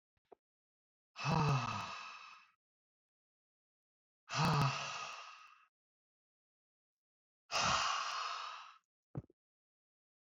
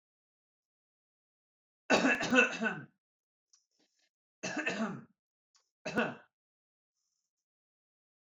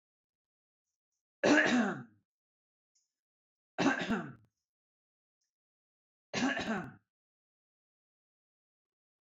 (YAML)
exhalation_length: 10.2 s
exhalation_amplitude: 3032
exhalation_signal_mean_std_ratio: 0.41
cough_length: 8.4 s
cough_amplitude: 11021
cough_signal_mean_std_ratio: 0.31
three_cough_length: 9.2 s
three_cough_amplitude: 6630
three_cough_signal_mean_std_ratio: 0.3
survey_phase: beta (2021-08-13 to 2022-03-07)
age: 18-44
gender: Male
wearing_mask: 'No'
symptom_none: true
smoker_status: Never smoked
respiratory_condition_asthma: false
respiratory_condition_other: false
recruitment_source: REACT
submission_delay: 1 day
covid_test_result: Negative
covid_test_method: RT-qPCR